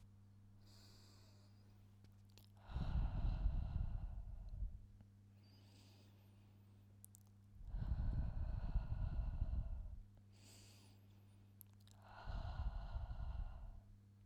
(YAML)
exhalation_length: 14.3 s
exhalation_amplitude: 1454
exhalation_signal_mean_std_ratio: 0.63
survey_phase: beta (2021-08-13 to 2022-03-07)
age: 18-44
gender: Female
wearing_mask: 'No'
symptom_abdominal_pain: true
symptom_onset: 7 days
smoker_status: Never smoked
respiratory_condition_asthma: false
respiratory_condition_other: false
recruitment_source: REACT
submission_delay: 4 days
covid_test_result: Negative
covid_test_method: RT-qPCR
influenza_a_test_result: Negative
influenza_b_test_result: Negative